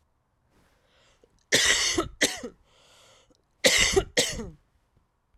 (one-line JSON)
{"cough_length": "5.4 s", "cough_amplitude": 18091, "cough_signal_mean_std_ratio": 0.39, "survey_phase": "alpha (2021-03-01 to 2021-08-12)", "age": "18-44", "gender": "Female", "wearing_mask": "No", "symptom_fatigue": true, "symptom_fever_high_temperature": true, "symptom_headache": true, "symptom_change_to_sense_of_smell_or_taste": true, "symptom_loss_of_taste": true, "symptom_onset": "5 days", "smoker_status": "Never smoked", "respiratory_condition_asthma": false, "respiratory_condition_other": false, "recruitment_source": "Test and Trace", "submission_delay": "2 days", "covid_test_result": "Positive", "covid_test_method": "RT-qPCR"}